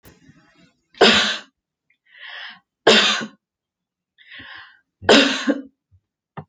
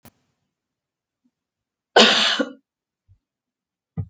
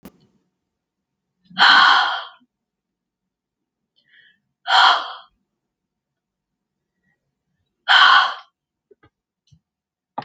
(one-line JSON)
{"three_cough_length": "6.5 s", "three_cough_amplitude": 30425, "three_cough_signal_mean_std_ratio": 0.34, "cough_length": "4.1 s", "cough_amplitude": 30814, "cough_signal_mean_std_ratio": 0.26, "exhalation_length": "10.2 s", "exhalation_amplitude": 32768, "exhalation_signal_mean_std_ratio": 0.3, "survey_phase": "alpha (2021-03-01 to 2021-08-12)", "age": "65+", "gender": "Female", "wearing_mask": "No", "symptom_none": true, "smoker_status": "Never smoked", "respiratory_condition_asthma": false, "respiratory_condition_other": false, "recruitment_source": "REACT", "submission_delay": "2 days", "covid_test_result": "Negative", "covid_test_method": "RT-qPCR"}